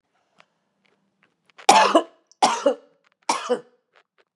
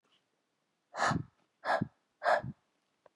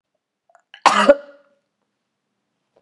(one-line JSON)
{"three_cough_length": "4.4 s", "three_cough_amplitude": 32768, "three_cough_signal_mean_std_ratio": 0.32, "exhalation_length": "3.2 s", "exhalation_amplitude": 5088, "exhalation_signal_mean_std_ratio": 0.37, "cough_length": "2.8 s", "cough_amplitude": 32768, "cough_signal_mean_std_ratio": 0.23, "survey_phase": "beta (2021-08-13 to 2022-03-07)", "age": "45-64", "gender": "Female", "wearing_mask": "No", "symptom_fatigue": true, "smoker_status": "Ex-smoker", "respiratory_condition_asthma": false, "respiratory_condition_other": false, "recruitment_source": "REACT", "submission_delay": "9 days", "covid_test_result": "Negative", "covid_test_method": "RT-qPCR", "influenza_a_test_result": "Negative", "influenza_b_test_result": "Negative"}